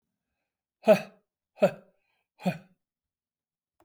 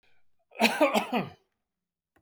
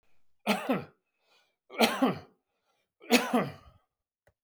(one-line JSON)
{"exhalation_length": "3.8 s", "exhalation_amplitude": 12951, "exhalation_signal_mean_std_ratio": 0.21, "cough_length": "2.2 s", "cough_amplitude": 15377, "cough_signal_mean_std_ratio": 0.39, "three_cough_length": "4.4 s", "three_cough_amplitude": 13714, "three_cough_signal_mean_std_ratio": 0.37, "survey_phase": "beta (2021-08-13 to 2022-03-07)", "age": "65+", "gender": "Male", "wearing_mask": "No", "symptom_none": true, "smoker_status": "Ex-smoker", "respiratory_condition_asthma": false, "respiratory_condition_other": false, "recruitment_source": "REACT", "submission_delay": "2 days", "covid_test_result": "Negative", "covid_test_method": "RT-qPCR", "influenza_a_test_result": "Negative", "influenza_b_test_result": "Negative"}